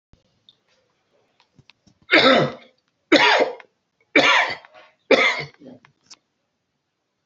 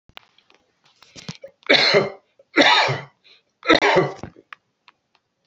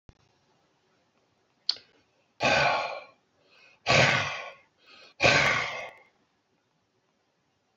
{
  "three_cough_length": "7.3 s",
  "three_cough_amplitude": 28945,
  "three_cough_signal_mean_std_ratio": 0.36,
  "cough_length": "5.5 s",
  "cough_amplitude": 32241,
  "cough_signal_mean_std_ratio": 0.39,
  "exhalation_length": "7.8 s",
  "exhalation_amplitude": 16096,
  "exhalation_signal_mean_std_ratio": 0.37,
  "survey_phase": "alpha (2021-03-01 to 2021-08-12)",
  "age": "65+",
  "gender": "Male",
  "wearing_mask": "No",
  "symptom_none": true,
  "smoker_status": "Ex-smoker",
  "respiratory_condition_asthma": false,
  "respiratory_condition_other": false,
  "recruitment_source": "REACT",
  "submission_delay": "2 days",
  "covid_test_result": "Negative",
  "covid_test_method": "RT-qPCR"
}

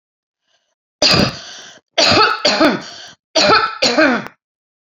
{
  "three_cough_length": "4.9 s",
  "three_cough_amplitude": 32087,
  "three_cough_signal_mean_std_ratio": 0.54,
  "survey_phase": "beta (2021-08-13 to 2022-03-07)",
  "age": "45-64",
  "gender": "Female",
  "wearing_mask": "No",
  "symptom_none": true,
  "symptom_onset": "7 days",
  "smoker_status": "Never smoked",
  "respiratory_condition_asthma": false,
  "respiratory_condition_other": false,
  "recruitment_source": "REACT",
  "submission_delay": "1 day",
  "covid_test_result": "Negative",
  "covid_test_method": "RT-qPCR"
}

